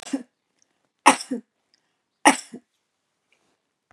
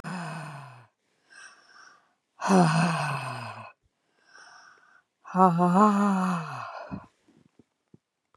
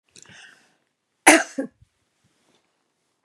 {"three_cough_length": "3.9 s", "three_cough_amplitude": 32414, "three_cough_signal_mean_std_ratio": 0.2, "exhalation_length": "8.4 s", "exhalation_amplitude": 14969, "exhalation_signal_mean_std_ratio": 0.45, "cough_length": "3.2 s", "cough_amplitude": 32767, "cough_signal_mean_std_ratio": 0.19, "survey_phase": "beta (2021-08-13 to 2022-03-07)", "age": "65+", "gender": "Female", "wearing_mask": "No", "symptom_none": true, "smoker_status": "Ex-smoker", "respiratory_condition_asthma": false, "respiratory_condition_other": false, "recruitment_source": "REACT", "submission_delay": "2 days", "covid_test_result": "Negative", "covid_test_method": "RT-qPCR", "influenza_a_test_result": "Negative", "influenza_b_test_result": "Negative"}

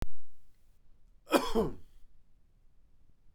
{"cough_length": "3.3 s", "cough_amplitude": 12092, "cough_signal_mean_std_ratio": 0.47, "survey_phase": "beta (2021-08-13 to 2022-03-07)", "age": "45-64", "gender": "Male", "wearing_mask": "No", "symptom_none": true, "smoker_status": "Never smoked", "respiratory_condition_asthma": false, "respiratory_condition_other": false, "recruitment_source": "REACT", "submission_delay": "5 days", "covid_test_result": "Negative", "covid_test_method": "RT-qPCR"}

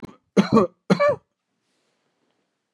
{"three_cough_length": "2.7 s", "three_cough_amplitude": 23447, "three_cough_signal_mean_std_ratio": 0.33, "survey_phase": "beta (2021-08-13 to 2022-03-07)", "age": "65+", "gender": "Male", "wearing_mask": "No", "symptom_none": true, "smoker_status": "Ex-smoker", "respiratory_condition_asthma": true, "respiratory_condition_other": false, "recruitment_source": "REACT", "submission_delay": "2 days", "covid_test_result": "Negative", "covid_test_method": "RT-qPCR", "influenza_a_test_result": "Negative", "influenza_b_test_result": "Negative"}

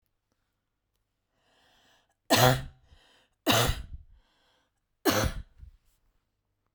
{"three_cough_length": "6.7 s", "three_cough_amplitude": 15749, "three_cough_signal_mean_std_ratio": 0.3, "survey_phase": "beta (2021-08-13 to 2022-03-07)", "age": "45-64", "gender": "Female", "wearing_mask": "No", "symptom_cough_any": true, "symptom_sore_throat": true, "symptom_fatigue": true, "smoker_status": "Never smoked", "respiratory_condition_asthma": false, "respiratory_condition_other": false, "recruitment_source": "REACT", "submission_delay": "1 day", "covid_test_result": "Negative", "covid_test_method": "RT-qPCR"}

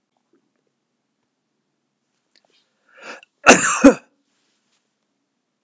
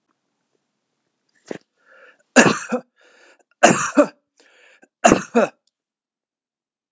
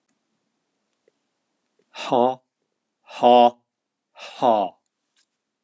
{"cough_length": "5.6 s", "cough_amplitude": 32768, "cough_signal_mean_std_ratio": 0.19, "three_cough_length": "6.9 s", "three_cough_amplitude": 32768, "three_cough_signal_mean_std_ratio": 0.27, "exhalation_length": "5.6 s", "exhalation_amplitude": 25282, "exhalation_signal_mean_std_ratio": 0.29, "survey_phase": "beta (2021-08-13 to 2022-03-07)", "age": "65+", "gender": "Male", "wearing_mask": "No", "symptom_none": true, "smoker_status": "Never smoked", "respiratory_condition_asthma": false, "respiratory_condition_other": false, "recruitment_source": "REACT", "submission_delay": "1 day", "covid_test_result": "Negative", "covid_test_method": "RT-qPCR", "influenza_a_test_result": "Negative", "influenza_b_test_result": "Negative"}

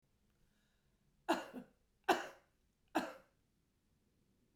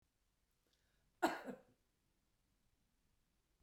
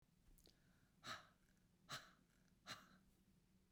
{"three_cough_length": "4.6 s", "three_cough_amplitude": 3806, "three_cough_signal_mean_std_ratio": 0.25, "cough_length": "3.6 s", "cough_amplitude": 2052, "cough_signal_mean_std_ratio": 0.19, "exhalation_length": "3.7 s", "exhalation_amplitude": 335, "exhalation_signal_mean_std_ratio": 0.45, "survey_phase": "beta (2021-08-13 to 2022-03-07)", "age": "65+", "gender": "Female", "wearing_mask": "No", "symptom_none": true, "smoker_status": "Current smoker (1 to 10 cigarettes per day)", "respiratory_condition_asthma": false, "respiratory_condition_other": false, "recruitment_source": "REACT", "submission_delay": "2 days", "covid_test_result": "Negative", "covid_test_method": "RT-qPCR"}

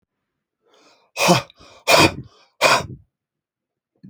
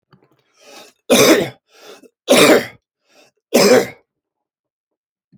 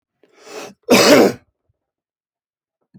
{"exhalation_length": "4.1 s", "exhalation_amplitude": 31481, "exhalation_signal_mean_std_ratio": 0.33, "three_cough_length": "5.4 s", "three_cough_amplitude": 32767, "three_cough_signal_mean_std_ratio": 0.37, "cough_length": "3.0 s", "cough_amplitude": 29393, "cough_signal_mean_std_ratio": 0.33, "survey_phase": "alpha (2021-03-01 to 2021-08-12)", "age": "65+", "gender": "Male", "wearing_mask": "No", "symptom_none": true, "smoker_status": "Never smoked", "respiratory_condition_asthma": false, "respiratory_condition_other": false, "recruitment_source": "REACT", "submission_delay": "1 day", "covid_test_result": "Negative", "covid_test_method": "RT-qPCR"}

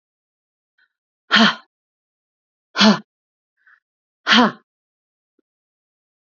{"exhalation_length": "6.2 s", "exhalation_amplitude": 31886, "exhalation_signal_mean_std_ratio": 0.25, "survey_phase": "alpha (2021-03-01 to 2021-08-12)", "age": "18-44", "gender": "Female", "wearing_mask": "No", "symptom_none": true, "smoker_status": "Never smoked", "respiratory_condition_asthma": false, "respiratory_condition_other": false, "recruitment_source": "REACT", "submission_delay": "1 day", "covid_test_result": "Negative", "covid_test_method": "RT-qPCR"}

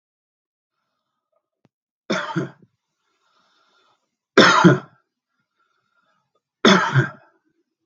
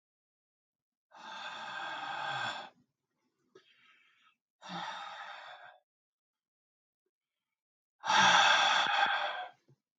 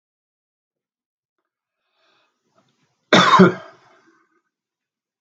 {"three_cough_length": "7.9 s", "three_cough_amplitude": 32768, "three_cough_signal_mean_std_ratio": 0.27, "exhalation_length": "10.0 s", "exhalation_amplitude": 7495, "exhalation_signal_mean_std_ratio": 0.39, "cough_length": "5.2 s", "cough_amplitude": 32768, "cough_signal_mean_std_ratio": 0.22, "survey_phase": "beta (2021-08-13 to 2022-03-07)", "age": "65+", "gender": "Male", "wearing_mask": "No", "symptom_none": true, "smoker_status": "Ex-smoker", "respiratory_condition_asthma": false, "respiratory_condition_other": false, "recruitment_source": "REACT", "submission_delay": "1 day", "covid_test_result": "Negative", "covid_test_method": "RT-qPCR", "influenza_a_test_result": "Negative", "influenza_b_test_result": "Negative"}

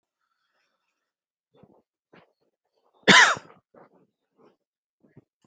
{"cough_length": "5.5 s", "cough_amplitude": 25279, "cough_signal_mean_std_ratio": 0.18, "survey_phase": "beta (2021-08-13 to 2022-03-07)", "age": "45-64", "gender": "Male", "wearing_mask": "No", "symptom_none": true, "smoker_status": "Never smoked", "respiratory_condition_asthma": false, "respiratory_condition_other": false, "recruitment_source": "REACT", "submission_delay": "2 days", "covid_test_result": "Negative", "covid_test_method": "RT-qPCR"}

